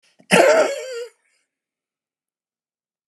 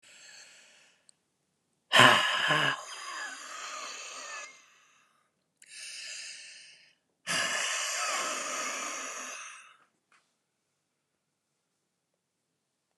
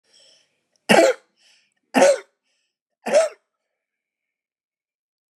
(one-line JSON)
{"cough_length": "3.1 s", "cough_amplitude": 32197, "cough_signal_mean_std_ratio": 0.34, "exhalation_length": "13.0 s", "exhalation_amplitude": 19570, "exhalation_signal_mean_std_ratio": 0.37, "three_cough_length": "5.4 s", "three_cough_amplitude": 31122, "three_cough_signal_mean_std_ratio": 0.28, "survey_phase": "beta (2021-08-13 to 2022-03-07)", "age": "65+", "gender": "Male", "wearing_mask": "No", "symptom_cough_any": true, "symptom_runny_or_blocked_nose": true, "symptom_fatigue": true, "symptom_fever_high_temperature": true, "smoker_status": "Ex-smoker", "respiratory_condition_asthma": true, "respiratory_condition_other": false, "recruitment_source": "Test and Trace", "submission_delay": "2 days", "covid_test_result": "Positive", "covid_test_method": "RT-qPCR", "covid_ct_value": 17.6, "covid_ct_gene": "ORF1ab gene", "covid_ct_mean": 18.1, "covid_viral_load": "1200000 copies/ml", "covid_viral_load_category": "High viral load (>1M copies/ml)"}